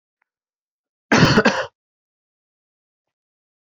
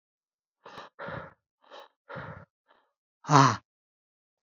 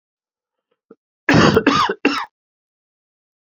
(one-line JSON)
{"cough_length": "3.7 s", "cough_amplitude": 27597, "cough_signal_mean_std_ratio": 0.28, "exhalation_length": "4.4 s", "exhalation_amplitude": 20750, "exhalation_signal_mean_std_ratio": 0.22, "three_cough_length": "3.4 s", "three_cough_amplitude": 32551, "three_cough_signal_mean_std_ratio": 0.37, "survey_phase": "beta (2021-08-13 to 2022-03-07)", "age": "45-64", "gender": "Male", "wearing_mask": "No", "symptom_fatigue": true, "symptom_change_to_sense_of_smell_or_taste": true, "symptom_loss_of_taste": true, "smoker_status": "Never smoked", "respiratory_condition_asthma": false, "respiratory_condition_other": false, "recruitment_source": "Test and Trace", "submission_delay": "1 day", "covid_test_result": "Positive", "covid_test_method": "RT-qPCR", "covid_ct_value": 16.4, "covid_ct_gene": "ORF1ab gene", "covid_ct_mean": 17.0, "covid_viral_load": "2600000 copies/ml", "covid_viral_load_category": "High viral load (>1M copies/ml)"}